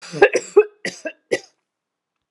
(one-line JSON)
{"three_cough_length": "2.3 s", "three_cough_amplitude": 32767, "three_cough_signal_mean_std_ratio": 0.3, "survey_phase": "alpha (2021-03-01 to 2021-08-12)", "age": "45-64", "gender": "Female", "wearing_mask": "No", "symptom_none": true, "symptom_onset": "13 days", "smoker_status": "Never smoked", "respiratory_condition_asthma": false, "respiratory_condition_other": false, "recruitment_source": "REACT", "submission_delay": "1 day", "covid_test_result": "Negative", "covid_test_method": "RT-qPCR"}